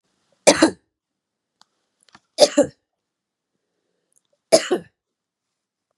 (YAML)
three_cough_length: 6.0 s
three_cough_amplitude: 32767
three_cough_signal_mean_std_ratio: 0.22
survey_phase: beta (2021-08-13 to 2022-03-07)
age: 45-64
gender: Female
wearing_mask: 'No'
symptom_cough_any: true
symptom_runny_or_blocked_nose: true
symptom_headache: true
symptom_onset: 1 day
smoker_status: Never smoked
respiratory_condition_asthma: false
respiratory_condition_other: false
recruitment_source: Test and Trace
submission_delay: 1 day
covid_test_result: Positive
covid_test_method: RT-qPCR
covid_ct_value: 18.4
covid_ct_gene: ORF1ab gene
covid_ct_mean: 18.7
covid_viral_load: 730000 copies/ml
covid_viral_load_category: Low viral load (10K-1M copies/ml)